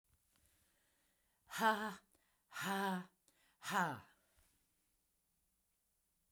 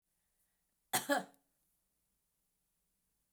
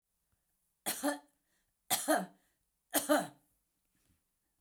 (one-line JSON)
{"exhalation_length": "6.3 s", "exhalation_amplitude": 2960, "exhalation_signal_mean_std_ratio": 0.34, "cough_length": "3.3 s", "cough_amplitude": 3493, "cough_signal_mean_std_ratio": 0.21, "three_cough_length": "4.6 s", "three_cough_amplitude": 5343, "three_cough_signal_mean_std_ratio": 0.33, "survey_phase": "beta (2021-08-13 to 2022-03-07)", "age": "65+", "gender": "Female", "wearing_mask": "No", "symptom_cough_any": true, "symptom_runny_or_blocked_nose": true, "symptom_sore_throat": true, "smoker_status": "Never smoked", "respiratory_condition_asthma": false, "respiratory_condition_other": false, "recruitment_source": "REACT", "submission_delay": "1 day", "covid_test_result": "Positive", "covid_test_method": "RT-qPCR", "covid_ct_value": 23.0, "covid_ct_gene": "E gene"}